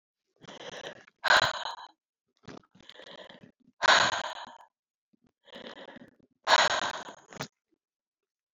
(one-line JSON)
{"exhalation_length": "8.5 s", "exhalation_amplitude": 13220, "exhalation_signal_mean_std_ratio": 0.32, "survey_phase": "alpha (2021-03-01 to 2021-08-12)", "age": "65+", "gender": "Female", "wearing_mask": "No", "symptom_cough_any": true, "symptom_onset": "4 days", "smoker_status": "Never smoked", "respiratory_condition_asthma": false, "respiratory_condition_other": false, "recruitment_source": "Test and Trace", "submission_delay": "2 days", "covid_test_result": "Positive", "covid_test_method": "RT-qPCR", "covid_ct_value": 15.5, "covid_ct_gene": "ORF1ab gene"}